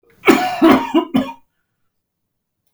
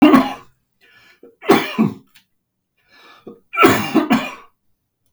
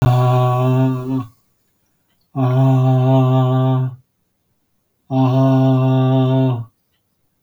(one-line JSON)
{"cough_length": "2.7 s", "cough_amplitude": 32768, "cough_signal_mean_std_ratio": 0.43, "three_cough_length": "5.1 s", "three_cough_amplitude": 32768, "three_cough_signal_mean_std_ratio": 0.39, "exhalation_length": "7.4 s", "exhalation_amplitude": 22868, "exhalation_signal_mean_std_ratio": 0.79, "survey_phase": "beta (2021-08-13 to 2022-03-07)", "age": "45-64", "gender": "Male", "wearing_mask": "No", "symptom_cough_any": true, "symptom_new_continuous_cough": true, "symptom_sore_throat": true, "symptom_fatigue": true, "symptom_fever_high_temperature": true, "symptom_headache": true, "smoker_status": "Never smoked", "respiratory_condition_asthma": false, "respiratory_condition_other": false, "recruitment_source": "Test and Trace", "submission_delay": "2 days", "covid_test_method": "RT-qPCR", "covid_ct_value": 34.5, "covid_ct_gene": "N gene", "covid_ct_mean": 34.5, "covid_viral_load": "4.8 copies/ml", "covid_viral_load_category": "Minimal viral load (< 10K copies/ml)"}